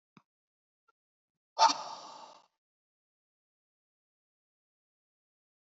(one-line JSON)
{"exhalation_length": "5.7 s", "exhalation_amplitude": 9285, "exhalation_signal_mean_std_ratio": 0.15, "survey_phase": "beta (2021-08-13 to 2022-03-07)", "age": "45-64", "gender": "Male", "wearing_mask": "No", "symptom_cough_any": true, "symptom_new_continuous_cough": true, "symptom_shortness_of_breath": true, "symptom_fatigue": true, "symptom_change_to_sense_of_smell_or_taste": true, "smoker_status": "Never smoked", "respiratory_condition_asthma": false, "respiratory_condition_other": false, "recruitment_source": "Test and Trace", "submission_delay": "2 days", "covid_test_result": "Positive", "covid_test_method": "RT-qPCR", "covid_ct_value": 26.2, "covid_ct_gene": "ORF1ab gene", "covid_ct_mean": 27.1, "covid_viral_load": "1300 copies/ml", "covid_viral_load_category": "Minimal viral load (< 10K copies/ml)"}